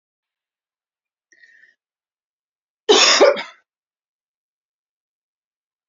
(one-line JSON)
{"cough_length": "5.9 s", "cough_amplitude": 30519, "cough_signal_mean_std_ratio": 0.23, "survey_phase": "beta (2021-08-13 to 2022-03-07)", "age": "18-44", "gender": "Female", "wearing_mask": "No", "symptom_cough_any": true, "symptom_runny_or_blocked_nose": true, "symptom_fatigue": true, "symptom_headache": true, "symptom_change_to_sense_of_smell_or_taste": true, "symptom_loss_of_taste": true, "symptom_onset": "5 days", "smoker_status": "Ex-smoker", "respiratory_condition_asthma": false, "respiratory_condition_other": false, "recruitment_source": "Test and Trace", "submission_delay": "1 day", "covid_test_result": "Positive", "covid_test_method": "RT-qPCR"}